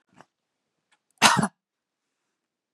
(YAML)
cough_length: 2.7 s
cough_amplitude: 29460
cough_signal_mean_std_ratio: 0.22
survey_phase: beta (2021-08-13 to 2022-03-07)
age: 18-44
gender: Female
wearing_mask: 'No'
symptom_none: true
smoker_status: Never smoked
respiratory_condition_asthma: false
respiratory_condition_other: false
recruitment_source: REACT
submission_delay: 3 days
covid_test_result: Negative
covid_test_method: RT-qPCR
influenza_a_test_result: Negative
influenza_b_test_result: Negative